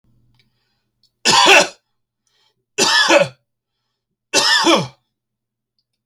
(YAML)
three_cough_length: 6.1 s
three_cough_amplitude: 32768
three_cough_signal_mean_std_ratio: 0.39
survey_phase: beta (2021-08-13 to 2022-03-07)
age: 45-64
gender: Male
wearing_mask: 'No'
symptom_none: true
smoker_status: Never smoked
respiratory_condition_asthma: false
respiratory_condition_other: false
recruitment_source: REACT
submission_delay: 1 day
covid_test_result: Negative
covid_test_method: RT-qPCR